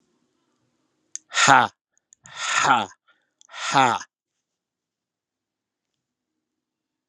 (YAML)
exhalation_length: 7.1 s
exhalation_amplitude: 32767
exhalation_signal_mean_std_ratio: 0.28
survey_phase: alpha (2021-03-01 to 2021-08-12)
age: 45-64
gender: Male
wearing_mask: 'No'
symptom_headache: true
smoker_status: Never smoked
respiratory_condition_asthma: false
respiratory_condition_other: false
recruitment_source: Test and Trace
submission_delay: 2 days
covid_test_result: Positive
covid_test_method: RT-qPCR
covid_ct_value: 13.4
covid_ct_gene: N gene
covid_ct_mean: 13.8
covid_viral_load: 29000000 copies/ml
covid_viral_load_category: High viral load (>1M copies/ml)